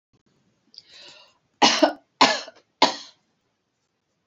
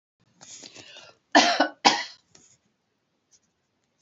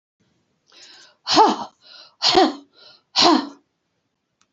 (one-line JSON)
{"three_cough_length": "4.3 s", "three_cough_amplitude": 26191, "three_cough_signal_mean_std_ratio": 0.27, "cough_length": "4.0 s", "cough_amplitude": 26666, "cough_signal_mean_std_ratio": 0.27, "exhalation_length": "4.5 s", "exhalation_amplitude": 27704, "exhalation_signal_mean_std_ratio": 0.36, "survey_phase": "beta (2021-08-13 to 2022-03-07)", "age": "65+", "gender": "Female", "wearing_mask": "No", "symptom_runny_or_blocked_nose": true, "smoker_status": "Never smoked", "respiratory_condition_asthma": false, "respiratory_condition_other": false, "recruitment_source": "REACT", "submission_delay": "4 days", "covid_test_result": "Negative", "covid_test_method": "RT-qPCR", "influenza_a_test_result": "Negative", "influenza_b_test_result": "Negative"}